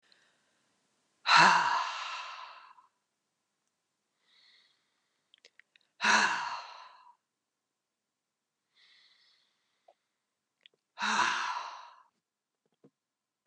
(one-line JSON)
{"exhalation_length": "13.5 s", "exhalation_amplitude": 14363, "exhalation_signal_mean_std_ratio": 0.29, "survey_phase": "beta (2021-08-13 to 2022-03-07)", "age": "45-64", "gender": "Female", "wearing_mask": "No", "symptom_runny_or_blocked_nose": true, "symptom_fatigue": true, "symptom_change_to_sense_of_smell_or_taste": true, "symptom_onset": "6 days", "smoker_status": "Never smoked", "respiratory_condition_asthma": false, "respiratory_condition_other": false, "recruitment_source": "REACT", "submission_delay": "1 day", "covid_test_result": "Positive", "covid_test_method": "RT-qPCR", "covid_ct_value": 35.0, "covid_ct_gene": "N gene", "influenza_a_test_result": "Negative", "influenza_b_test_result": "Negative"}